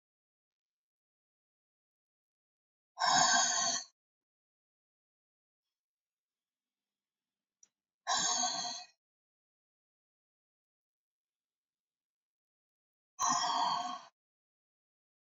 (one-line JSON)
{"exhalation_length": "15.3 s", "exhalation_amplitude": 5399, "exhalation_signal_mean_std_ratio": 0.3, "survey_phase": "beta (2021-08-13 to 2022-03-07)", "age": "65+", "gender": "Female", "wearing_mask": "No", "symptom_none": true, "smoker_status": "Never smoked", "respiratory_condition_asthma": false, "respiratory_condition_other": false, "recruitment_source": "REACT", "submission_delay": "1 day", "covid_test_result": "Negative", "covid_test_method": "RT-qPCR"}